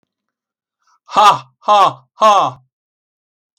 {"exhalation_length": "3.6 s", "exhalation_amplitude": 32768, "exhalation_signal_mean_std_ratio": 0.38, "survey_phase": "beta (2021-08-13 to 2022-03-07)", "age": "65+", "gender": "Male", "wearing_mask": "No", "symptom_sore_throat": true, "symptom_fatigue": true, "smoker_status": "Never smoked", "respiratory_condition_asthma": true, "respiratory_condition_other": false, "recruitment_source": "REACT", "submission_delay": "1 day", "covid_test_result": "Negative", "covid_test_method": "RT-qPCR"}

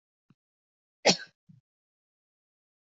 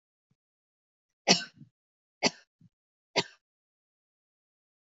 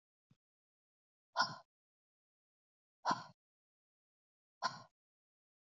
{"cough_length": "3.0 s", "cough_amplitude": 13505, "cough_signal_mean_std_ratio": 0.15, "three_cough_length": "4.9 s", "three_cough_amplitude": 19317, "three_cough_signal_mean_std_ratio": 0.17, "exhalation_length": "5.7 s", "exhalation_amplitude": 3427, "exhalation_signal_mean_std_ratio": 0.2, "survey_phase": "beta (2021-08-13 to 2022-03-07)", "age": "45-64", "gender": "Female", "wearing_mask": "No", "symptom_none": true, "smoker_status": "Never smoked", "respiratory_condition_asthma": false, "respiratory_condition_other": false, "recruitment_source": "REACT", "submission_delay": "1 day", "covid_test_result": "Negative", "covid_test_method": "RT-qPCR", "influenza_a_test_result": "Negative", "influenza_b_test_result": "Negative"}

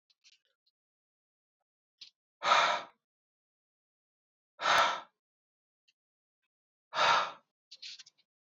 {"exhalation_length": "8.5 s", "exhalation_amplitude": 6944, "exhalation_signal_mean_std_ratio": 0.29, "survey_phase": "alpha (2021-03-01 to 2021-08-12)", "age": "18-44", "gender": "Male", "wearing_mask": "No", "symptom_none": true, "smoker_status": "Current smoker (e-cigarettes or vapes only)", "respiratory_condition_asthma": true, "respiratory_condition_other": false, "recruitment_source": "REACT", "submission_delay": "1 day", "covid_test_result": "Negative", "covid_test_method": "RT-qPCR"}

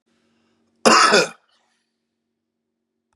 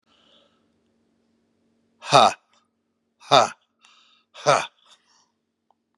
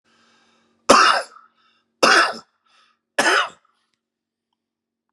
{"cough_length": "3.2 s", "cough_amplitude": 32768, "cough_signal_mean_std_ratio": 0.29, "exhalation_length": "6.0 s", "exhalation_amplitude": 31848, "exhalation_signal_mean_std_ratio": 0.22, "three_cough_length": "5.1 s", "three_cough_amplitude": 32768, "three_cough_signal_mean_std_ratio": 0.33, "survey_phase": "beta (2021-08-13 to 2022-03-07)", "age": "45-64", "gender": "Male", "wearing_mask": "No", "symptom_cough_any": true, "symptom_runny_or_blocked_nose": true, "symptom_sore_throat": true, "smoker_status": "Ex-smoker", "respiratory_condition_asthma": false, "respiratory_condition_other": false, "recruitment_source": "Test and Trace", "submission_delay": "2 days", "covid_test_result": "Positive", "covid_test_method": "LFT"}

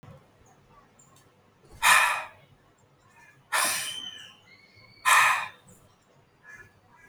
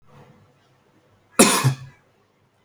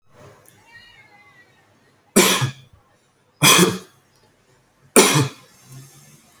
{"exhalation_length": "7.1 s", "exhalation_amplitude": 15863, "exhalation_signal_mean_std_ratio": 0.35, "cough_length": "2.6 s", "cough_amplitude": 32768, "cough_signal_mean_std_ratio": 0.28, "three_cough_length": "6.4 s", "three_cough_amplitude": 32768, "three_cough_signal_mean_std_ratio": 0.32, "survey_phase": "beta (2021-08-13 to 2022-03-07)", "age": "18-44", "gender": "Male", "wearing_mask": "No", "symptom_none": true, "smoker_status": "Never smoked", "respiratory_condition_asthma": false, "respiratory_condition_other": false, "recruitment_source": "REACT", "submission_delay": "1 day", "covid_test_result": "Negative", "covid_test_method": "RT-qPCR"}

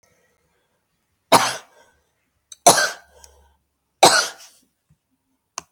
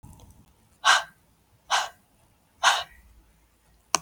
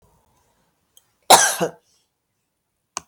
{"three_cough_length": "5.7 s", "three_cough_amplitude": 32768, "three_cough_signal_mean_std_ratio": 0.25, "exhalation_length": "4.0 s", "exhalation_amplitude": 32143, "exhalation_signal_mean_std_ratio": 0.29, "cough_length": "3.1 s", "cough_amplitude": 32768, "cough_signal_mean_std_ratio": 0.23, "survey_phase": "beta (2021-08-13 to 2022-03-07)", "age": "45-64", "gender": "Female", "wearing_mask": "No", "symptom_cough_any": true, "symptom_runny_or_blocked_nose": true, "symptom_sore_throat": true, "symptom_headache": true, "symptom_onset": "11 days", "smoker_status": "Never smoked", "respiratory_condition_asthma": false, "respiratory_condition_other": false, "recruitment_source": "REACT", "submission_delay": "1 day", "covid_test_result": "Negative", "covid_test_method": "RT-qPCR", "influenza_a_test_result": "Negative", "influenza_b_test_result": "Negative"}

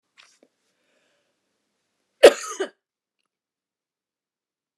{"cough_length": "4.8 s", "cough_amplitude": 29204, "cough_signal_mean_std_ratio": 0.13, "survey_phase": "alpha (2021-03-01 to 2021-08-12)", "age": "65+", "gender": "Female", "wearing_mask": "No", "symptom_none": true, "smoker_status": "Never smoked", "respiratory_condition_asthma": false, "respiratory_condition_other": false, "recruitment_source": "REACT", "submission_delay": "1 day", "covid_test_result": "Negative", "covid_test_method": "RT-qPCR"}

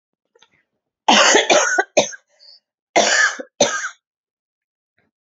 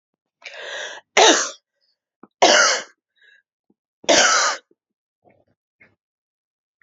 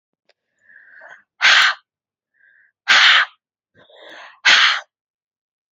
{"cough_length": "5.2 s", "cough_amplitude": 30562, "cough_signal_mean_std_ratio": 0.43, "three_cough_length": "6.8 s", "three_cough_amplitude": 32768, "three_cough_signal_mean_std_ratio": 0.34, "exhalation_length": "5.7 s", "exhalation_amplitude": 31150, "exhalation_signal_mean_std_ratio": 0.36, "survey_phase": "alpha (2021-03-01 to 2021-08-12)", "age": "45-64", "gender": "Female", "wearing_mask": "No", "symptom_cough_any": true, "symptom_fatigue": true, "symptom_change_to_sense_of_smell_or_taste": true, "symptom_onset": "3 days", "smoker_status": "Never smoked", "respiratory_condition_asthma": false, "respiratory_condition_other": false, "recruitment_source": "Test and Trace", "submission_delay": "1 day", "covid_test_result": "Positive", "covid_test_method": "RT-qPCR", "covid_ct_value": 13.4, "covid_ct_gene": "S gene", "covid_ct_mean": 13.8, "covid_viral_load": "30000000 copies/ml", "covid_viral_load_category": "High viral load (>1M copies/ml)"}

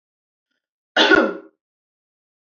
{"cough_length": "2.6 s", "cough_amplitude": 25975, "cough_signal_mean_std_ratio": 0.29, "survey_phase": "beta (2021-08-13 to 2022-03-07)", "age": "18-44", "gender": "Female", "wearing_mask": "No", "symptom_runny_or_blocked_nose": true, "smoker_status": "Never smoked", "respiratory_condition_asthma": true, "respiratory_condition_other": false, "recruitment_source": "REACT", "submission_delay": "2 days", "covid_test_result": "Negative", "covid_test_method": "RT-qPCR", "influenza_a_test_result": "Negative", "influenza_b_test_result": "Negative"}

